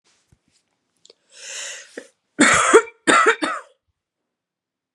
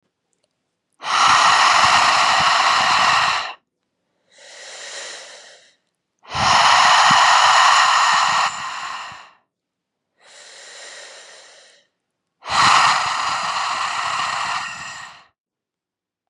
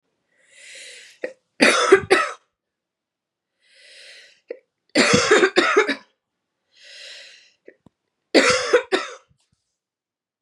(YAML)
cough_length: 4.9 s
cough_amplitude: 32767
cough_signal_mean_std_ratio: 0.34
exhalation_length: 16.3 s
exhalation_amplitude: 31576
exhalation_signal_mean_std_ratio: 0.59
three_cough_length: 10.4 s
three_cough_amplitude: 32136
three_cough_signal_mean_std_ratio: 0.36
survey_phase: beta (2021-08-13 to 2022-03-07)
age: 18-44
gender: Female
wearing_mask: 'No'
symptom_cough_any: true
symptom_new_continuous_cough: true
symptom_runny_or_blocked_nose: true
symptom_sore_throat: true
symptom_onset: 3 days
smoker_status: Never smoked
respiratory_condition_asthma: false
respiratory_condition_other: false
recruitment_source: Test and Trace
submission_delay: 2 days
covid_test_result: Positive
covid_test_method: RT-qPCR
covid_ct_value: 18.9
covid_ct_gene: ORF1ab gene
covid_ct_mean: 19.6
covid_viral_load: 360000 copies/ml
covid_viral_load_category: Low viral load (10K-1M copies/ml)